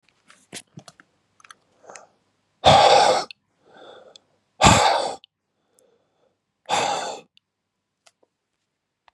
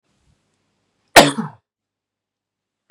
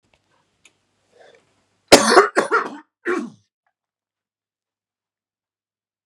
{
  "exhalation_length": "9.1 s",
  "exhalation_amplitude": 32460,
  "exhalation_signal_mean_std_ratio": 0.31,
  "cough_length": "2.9 s",
  "cough_amplitude": 32768,
  "cough_signal_mean_std_ratio": 0.19,
  "three_cough_length": "6.1 s",
  "three_cough_amplitude": 32768,
  "three_cough_signal_mean_std_ratio": 0.24,
  "survey_phase": "beta (2021-08-13 to 2022-03-07)",
  "age": "18-44",
  "gender": "Male",
  "wearing_mask": "No",
  "symptom_none": true,
  "symptom_onset": "12 days",
  "smoker_status": "Ex-smoker",
  "respiratory_condition_asthma": true,
  "respiratory_condition_other": false,
  "recruitment_source": "REACT",
  "submission_delay": "12 days",
  "covid_test_result": "Negative",
  "covid_test_method": "RT-qPCR",
  "influenza_a_test_result": "Negative",
  "influenza_b_test_result": "Negative"
}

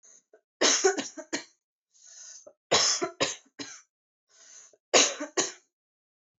{
  "three_cough_length": "6.4 s",
  "three_cough_amplitude": 17100,
  "three_cough_signal_mean_std_ratio": 0.37,
  "survey_phase": "beta (2021-08-13 to 2022-03-07)",
  "age": "18-44",
  "gender": "Female",
  "wearing_mask": "No",
  "symptom_runny_or_blocked_nose": true,
  "symptom_fatigue": true,
  "symptom_headache": true,
  "symptom_other": true,
  "smoker_status": "Never smoked",
  "respiratory_condition_asthma": false,
  "respiratory_condition_other": false,
  "recruitment_source": "Test and Trace",
  "submission_delay": "2 days",
  "covid_test_result": "Positive",
  "covid_test_method": "RT-qPCR",
  "covid_ct_value": 19.5,
  "covid_ct_gene": "ORF1ab gene",
  "covid_ct_mean": 19.9,
  "covid_viral_load": "300000 copies/ml",
  "covid_viral_load_category": "Low viral load (10K-1M copies/ml)"
}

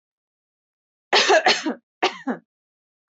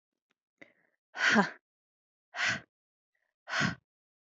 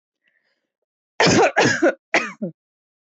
{
  "three_cough_length": "3.2 s",
  "three_cough_amplitude": 19731,
  "three_cough_signal_mean_std_ratio": 0.37,
  "exhalation_length": "4.4 s",
  "exhalation_amplitude": 11407,
  "exhalation_signal_mean_std_ratio": 0.31,
  "cough_length": "3.1 s",
  "cough_amplitude": 19927,
  "cough_signal_mean_std_ratio": 0.43,
  "survey_phase": "alpha (2021-03-01 to 2021-08-12)",
  "age": "18-44",
  "gender": "Female",
  "wearing_mask": "No",
  "symptom_cough_any": true,
  "symptom_fatigue": true,
  "symptom_onset": "1 day",
  "smoker_status": "Never smoked",
  "respiratory_condition_asthma": false,
  "respiratory_condition_other": false,
  "recruitment_source": "Test and Trace",
  "submission_delay": "1 day",
  "covid_test_result": "Positive",
  "covid_test_method": "RT-qPCR",
  "covid_ct_value": 27.0,
  "covid_ct_gene": "ORF1ab gene",
  "covid_ct_mean": 27.9,
  "covid_viral_load": "730 copies/ml",
  "covid_viral_load_category": "Minimal viral load (< 10K copies/ml)"
}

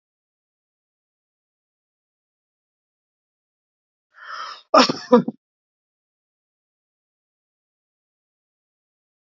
{
  "cough_length": "9.3 s",
  "cough_amplitude": 29686,
  "cough_signal_mean_std_ratio": 0.15,
  "survey_phase": "alpha (2021-03-01 to 2021-08-12)",
  "age": "65+",
  "gender": "Male",
  "wearing_mask": "No",
  "symptom_none": true,
  "smoker_status": "Ex-smoker",
  "respiratory_condition_asthma": false,
  "respiratory_condition_other": false,
  "recruitment_source": "REACT",
  "submission_delay": "-1 day",
  "covid_test_result": "Negative",
  "covid_test_method": "RT-qPCR"
}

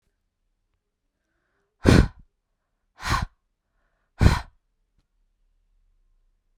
{
  "exhalation_length": "6.6 s",
  "exhalation_amplitude": 32768,
  "exhalation_signal_mean_std_ratio": 0.21,
  "survey_phase": "beta (2021-08-13 to 2022-03-07)",
  "age": "18-44",
  "gender": "Female",
  "wearing_mask": "No",
  "symptom_none": true,
  "smoker_status": "Never smoked",
  "respiratory_condition_asthma": false,
  "respiratory_condition_other": false,
  "recruitment_source": "REACT",
  "submission_delay": "4 days",
  "covid_test_result": "Negative",
  "covid_test_method": "RT-qPCR"
}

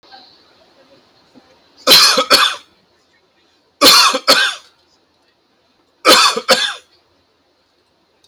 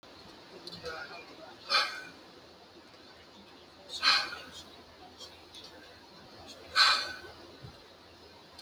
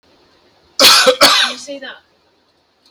{
  "three_cough_length": "8.3 s",
  "three_cough_amplitude": 32768,
  "three_cough_signal_mean_std_ratio": 0.38,
  "exhalation_length": "8.6 s",
  "exhalation_amplitude": 11196,
  "exhalation_signal_mean_std_ratio": 0.38,
  "cough_length": "2.9 s",
  "cough_amplitude": 32768,
  "cough_signal_mean_std_ratio": 0.43,
  "survey_phase": "alpha (2021-03-01 to 2021-08-12)",
  "age": "18-44",
  "gender": "Male",
  "wearing_mask": "No",
  "symptom_none": true,
  "smoker_status": "Never smoked",
  "respiratory_condition_asthma": false,
  "respiratory_condition_other": false,
  "recruitment_source": "REACT",
  "covid_test_method": "RT-qPCR"
}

